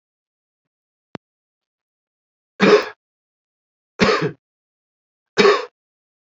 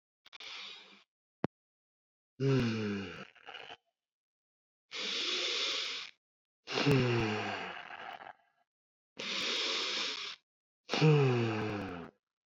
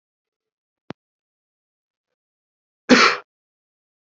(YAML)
three_cough_length: 6.4 s
three_cough_amplitude: 28232
three_cough_signal_mean_std_ratio: 0.27
exhalation_length: 12.5 s
exhalation_amplitude: 5878
exhalation_signal_mean_std_ratio: 0.52
cough_length: 4.1 s
cough_amplitude: 30082
cough_signal_mean_std_ratio: 0.19
survey_phase: alpha (2021-03-01 to 2021-08-12)
age: 18-44
gender: Male
wearing_mask: 'Yes'
symptom_cough_any: true
symptom_fatigue: true
symptom_headache: true
symptom_loss_of_taste: true
symptom_onset: 4 days
smoker_status: Never smoked
respiratory_condition_asthma: false
respiratory_condition_other: false
recruitment_source: Test and Trace
submission_delay: 2 days
covid_test_result: Positive
covid_test_method: RT-qPCR
covid_ct_value: 16.1
covid_ct_gene: ORF1ab gene
covid_ct_mean: 16.4
covid_viral_load: 4100000 copies/ml
covid_viral_load_category: High viral load (>1M copies/ml)